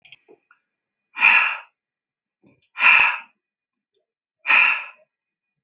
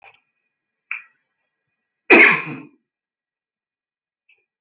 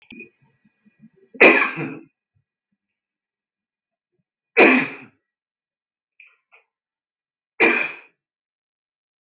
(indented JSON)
{
  "exhalation_length": "5.6 s",
  "exhalation_amplitude": 25729,
  "exhalation_signal_mean_std_ratio": 0.35,
  "cough_length": "4.6 s",
  "cough_amplitude": 30770,
  "cough_signal_mean_std_ratio": 0.22,
  "three_cough_length": "9.2 s",
  "three_cough_amplitude": 29543,
  "three_cough_signal_mean_std_ratio": 0.25,
  "survey_phase": "beta (2021-08-13 to 2022-03-07)",
  "age": "18-44",
  "gender": "Male",
  "wearing_mask": "No",
  "symptom_cough_any": true,
  "symptom_onset": "12 days",
  "smoker_status": "Never smoked",
  "respiratory_condition_asthma": false,
  "respiratory_condition_other": false,
  "recruitment_source": "REACT",
  "submission_delay": "1 day",
  "covid_test_result": "Negative",
  "covid_test_method": "RT-qPCR",
  "influenza_a_test_result": "Unknown/Void",
  "influenza_b_test_result": "Unknown/Void"
}